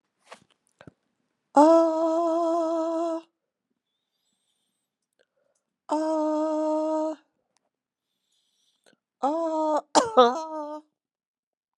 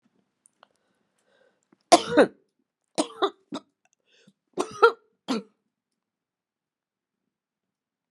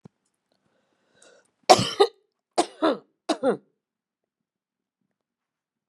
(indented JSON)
{
  "exhalation_length": "11.8 s",
  "exhalation_amplitude": 25067,
  "exhalation_signal_mean_std_ratio": 0.45,
  "three_cough_length": "8.1 s",
  "three_cough_amplitude": 26947,
  "three_cough_signal_mean_std_ratio": 0.2,
  "cough_length": "5.9 s",
  "cough_amplitude": 32109,
  "cough_signal_mean_std_ratio": 0.23,
  "survey_phase": "beta (2021-08-13 to 2022-03-07)",
  "age": "45-64",
  "gender": "Female",
  "wearing_mask": "No",
  "symptom_cough_any": true,
  "symptom_runny_or_blocked_nose": true,
  "symptom_sore_throat": true,
  "symptom_fatigue": true,
  "symptom_headache": true,
  "symptom_other": true,
  "symptom_onset": "3 days",
  "smoker_status": "Never smoked",
  "respiratory_condition_asthma": true,
  "respiratory_condition_other": false,
  "recruitment_source": "Test and Trace",
  "submission_delay": "2 days",
  "covid_test_result": "Positive",
  "covid_test_method": "ePCR"
}